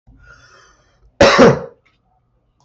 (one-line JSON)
{"cough_length": "2.6 s", "cough_amplitude": 32768, "cough_signal_mean_std_ratio": 0.32, "survey_phase": "beta (2021-08-13 to 2022-03-07)", "age": "65+", "gender": "Male", "wearing_mask": "No", "symptom_runny_or_blocked_nose": true, "smoker_status": "Never smoked", "respiratory_condition_asthma": false, "respiratory_condition_other": false, "recruitment_source": "REACT", "submission_delay": "2 days", "covid_test_result": "Negative", "covid_test_method": "RT-qPCR", "influenza_a_test_result": "Negative", "influenza_b_test_result": "Negative"}